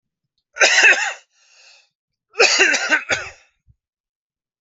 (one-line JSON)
{"cough_length": "4.6 s", "cough_amplitude": 29688, "cough_signal_mean_std_ratio": 0.41, "survey_phase": "alpha (2021-03-01 to 2021-08-12)", "age": "45-64", "gender": "Male", "wearing_mask": "No", "symptom_cough_any": true, "smoker_status": "Never smoked", "respiratory_condition_asthma": false, "respiratory_condition_other": false, "recruitment_source": "REACT", "submission_delay": "8 days", "covid_test_result": "Negative", "covid_test_method": "RT-qPCR"}